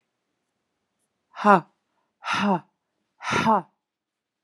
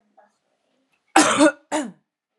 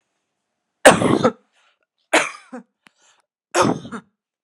{"exhalation_length": "4.4 s", "exhalation_amplitude": 26963, "exhalation_signal_mean_std_ratio": 0.31, "cough_length": "2.4 s", "cough_amplitude": 32767, "cough_signal_mean_std_ratio": 0.34, "three_cough_length": "4.4 s", "three_cough_amplitude": 32768, "three_cough_signal_mean_std_ratio": 0.31, "survey_phase": "beta (2021-08-13 to 2022-03-07)", "age": "18-44", "gender": "Female", "wearing_mask": "No", "symptom_cough_any": true, "symptom_sore_throat": true, "symptom_headache": true, "symptom_onset": "7 days", "smoker_status": "Ex-smoker", "respiratory_condition_asthma": false, "respiratory_condition_other": false, "recruitment_source": "Test and Trace", "submission_delay": "1 day", "covid_test_result": "Negative", "covid_test_method": "RT-qPCR"}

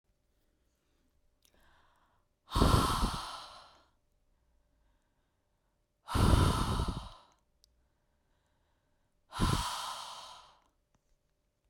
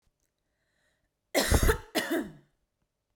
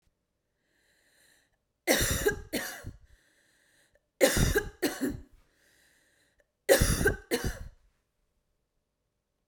{"exhalation_length": "11.7 s", "exhalation_amplitude": 9645, "exhalation_signal_mean_std_ratio": 0.34, "cough_length": "3.2 s", "cough_amplitude": 11357, "cough_signal_mean_std_ratio": 0.36, "three_cough_length": "9.5 s", "three_cough_amplitude": 13889, "three_cough_signal_mean_std_ratio": 0.36, "survey_phase": "beta (2021-08-13 to 2022-03-07)", "age": "18-44", "gender": "Female", "wearing_mask": "No", "symptom_none": true, "smoker_status": "Never smoked", "respiratory_condition_asthma": false, "respiratory_condition_other": false, "recruitment_source": "REACT", "submission_delay": "1 day", "covid_test_result": "Negative", "covid_test_method": "RT-qPCR"}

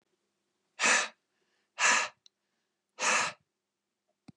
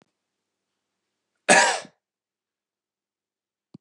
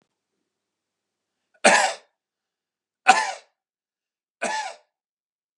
{"exhalation_length": "4.4 s", "exhalation_amplitude": 7929, "exhalation_signal_mean_std_ratio": 0.36, "cough_length": "3.8 s", "cough_amplitude": 27401, "cough_signal_mean_std_ratio": 0.21, "three_cough_length": "5.6 s", "three_cough_amplitude": 32767, "three_cough_signal_mean_std_ratio": 0.25, "survey_phase": "beta (2021-08-13 to 2022-03-07)", "age": "18-44", "gender": "Male", "wearing_mask": "No", "symptom_none": true, "smoker_status": "Never smoked", "respiratory_condition_asthma": false, "respiratory_condition_other": false, "recruitment_source": "Test and Trace", "submission_delay": "1 day", "covid_test_result": "Negative", "covid_test_method": "RT-qPCR"}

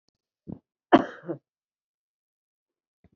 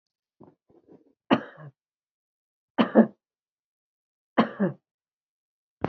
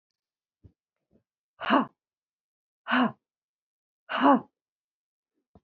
{"cough_length": "3.2 s", "cough_amplitude": 22570, "cough_signal_mean_std_ratio": 0.15, "three_cough_length": "5.9 s", "three_cough_amplitude": 22370, "three_cough_signal_mean_std_ratio": 0.22, "exhalation_length": "5.6 s", "exhalation_amplitude": 15246, "exhalation_signal_mean_std_ratio": 0.27, "survey_phase": "beta (2021-08-13 to 2022-03-07)", "age": "65+", "gender": "Female", "wearing_mask": "No", "symptom_none": true, "smoker_status": "Never smoked", "respiratory_condition_asthma": true, "respiratory_condition_other": false, "recruitment_source": "REACT", "submission_delay": "3 days", "covid_test_result": "Negative", "covid_test_method": "RT-qPCR"}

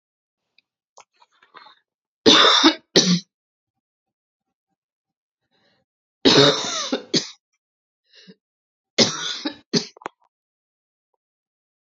{"three_cough_length": "11.9 s", "three_cough_amplitude": 32767, "three_cough_signal_mean_std_ratio": 0.29, "survey_phase": "beta (2021-08-13 to 2022-03-07)", "age": "18-44", "gender": "Female", "wearing_mask": "No", "symptom_cough_any": true, "symptom_sore_throat": true, "symptom_diarrhoea": true, "symptom_fatigue": true, "symptom_fever_high_temperature": true, "smoker_status": "Ex-smoker", "respiratory_condition_asthma": false, "respiratory_condition_other": false, "recruitment_source": "Test and Trace", "submission_delay": "2 days", "covid_test_result": "Positive", "covid_test_method": "RT-qPCR", "covid_ct_value": 25.3, "covid_ct_gene": "ORF1ab gene"}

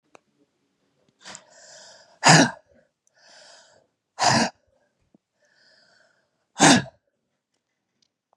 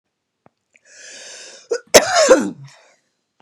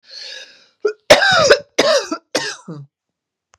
{"exhalation_length": "8.4 s", "exhalation_amplitude": 32145, "exhalation_signal_mean_std_ratio": 0.24, "cough_length": "3.4 s", "cough_amplitude": 32768, "cough_signal_mean_std_ratio": 0.32, "three_cough_length": "3.6 s", "three_cough_amplitude": 32768, "three_cough_signal_mean_std_ratio": 0.43, "survey_phase": "beta (2021-08-13 to 2022-03-07)", "age": "45-64", "gender": "Female", "wearing_mask": "No", "symptom_none": true, "smoker_status": "Never smoked", "respiratory_condition_asthma": true, "respiratory_condition_other": false, "recruitment_source": "REACT", "submission_delay": "2 days", "covid_test_result": "Negative", "covid_test_method": "RT-qPCR", "influenza_a_test_result": "Negative", "influenza_b_test_result": "Negative"}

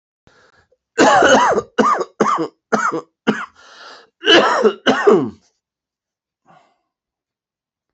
{"cough_length": "7.9 s", "cough_amplitude": 29730, "cough_signal_mean_std_ratio": 0.46, "survey_phase": "beta (2021-08-13 to 2022-03-07)", "age": "45-64", "gender": "Male", "wearing_mask": "No", "symptom_change_to_sense_of_smell_or_taste": true, "symptom_loss_of_taste": true, "smoker_status": "Never smoked", "respiratory_condition_asthma": false, "respiratory_condition_other": false, "recruitment_source": "Test and Trace", "submission_delay": "2 days", "covid_test_result": "Positive", "covid_test_method": "RT-qPCR", "covid_ct_value": 13.0, "covid_ct_gene": "ORF1ab gene", "covid_ct_mean": 13.2, "covid_viral_load": "48000000 copies/ml", "covid_viral_load_category": "High viral load (>1M copies/ml)"}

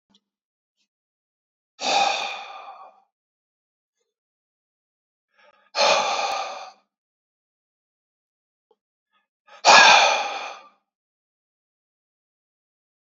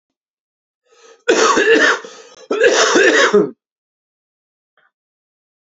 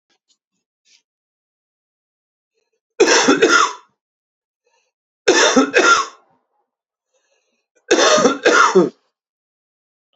{"exhalation_length": "13.1 s", "exhalation_amplitude": 32767, "exhalation_signal_mean_std_ratio": 0.28, "cough_length": "5.6 s", "cough_amplitude": 32259, "cough_signal_mean_std_ratio": 0.47, "three_cough_length": "10.2 s", "three_cough_amplitude": 32767, "three_cough_signal_mean_std_ratio": 0.39, "survey_phase": "beta (2021-08-13 to 2022-03-07)", "age": "18-44", "gender": "Male", "wearing_mask": "No", "symptom_cough_any": true, "symptom_runny_or_blocked_nose": true, "symptom_sore_throat": true, "symptom_change_to_sense_of_smell_or_taste": true, "symptom_onset": "3 days", "smoker_status": "Never smoked", "respiratory_condition_asthma": true, "respiratory_condition_other": false, "recruitment_source": "Test and Trace", "submission_delay": "2 days", "covid_test_result": "Positive", "covid_test_method": "LAMP"}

